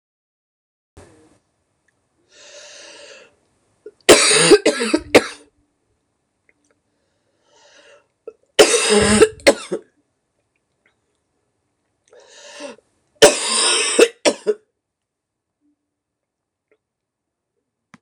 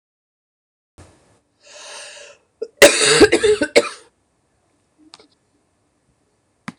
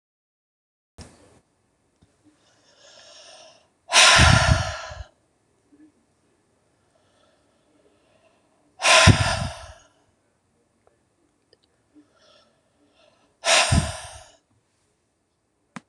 {"three_cough_length": "18.0 s", "three_cough_amplitude": 26028, "three_cough_signal_mean_std_ratio": 0.29, "cough_length": "6.8 s", "cough_amplitude": 26028, "cough_signal_mean_std_ratio": 0.28, "exhalation_length": "15.9 s", "exhalation_amplitude": 26028, "exhalation_signal_mean_std_ratio": 0.27, "survey_phase": "beta (2021-08-13 to 2022-03-07)", "age": "45-64", "gender": "Female", "wearing_mask": "No", "symptom_cough_any": true, "symptom_runny_or_blocked_nose": true, "symptom_headache": true, "symptom_change_to_sense_of_smell_or_taste": true, "smoker_status": "Never smoked", "respiratory_condition_asthma": false, "respiratory_condition_other": false, "recruitment_source": "Test and Trace", "submission_delay": "3 days", "covid_test_result": "Positive", "covid_test_method": "RT-qPCR", "covid_ct_value": 21.4, "covid_ct_gene": "ORF1ab gene", "covid_ct_mean": 22.0, "covid_viral_load": "63000 copies/ml", "covid_viral_load_category": "Low viral load (10K-1M copies/ml)"}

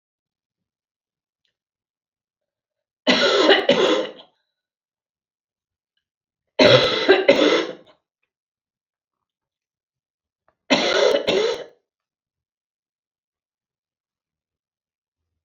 {"three_cough_length": "15.4 s", "three_cough_amplitude": 32534, "three_cough_signal_mean_std_ratio": 0.33, "survey_phase": "beta (2021-08-13 to 2022-03-07)", "age": "45-64", "gender": "Female", "wearing_mask": "No", "symptom_cough_any": true, "symptom_fatigue": true, "symptom_headache": true, "symptom_change_to_sense_of_smell_or_taste": true, "symptom_onset": "6 days", "smoker_status": "Never smoked", "respiratory_condition_asthma": true, "respiratory_condition_other": false, "recruitment_source": "Test and Trace", "submission_delay": "1 day", "covid_test_result": "Positive", "covid_test_method": "RT-qPCR", "covid_ct_value": 18.8, "covid_ct_gene": "ORF1ab gene", "covid_ct_mean": 19.4, "covid_viral_load": "440000 copies/ml", "covid_viral_load_category": "Low viral load (10K-1M copies/ml)"}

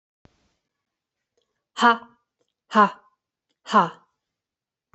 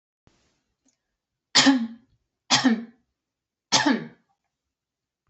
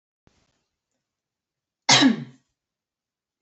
{"exhalation_length": "4.9 s", "exhalation_amplitude": 23651, "exhalation_signal_mean_std_ratio": 0.24, "three_cough_length": "5.3 s", "three_cough_amplitude": 21211, "three_cough_signal_mean_std_ratio": 0.32, "cough_length": "3.4 s", "cough_amplitude": 25538, "cough_signal_mean_std_ratio": 0.23, "survey_phase": "beta (2021-08-13 to 2022-03-07)", "age": "18-44", "gender": "Female", "wearing_mask": "No", "symptom_none": true, "symptom_onset": "6 days", "smoker_status": "Never smoked", "respiratory_condition_asthma": false, "respiratory_condition_other": false, "recruitment_source": "REACT", "submission_delay": "2 days", "covid_test_result": "Negative", "covid_test_method": "RT-qPCR", "influenza_a_test_result": "Negative", "influenza_b_test_result": "Negative"}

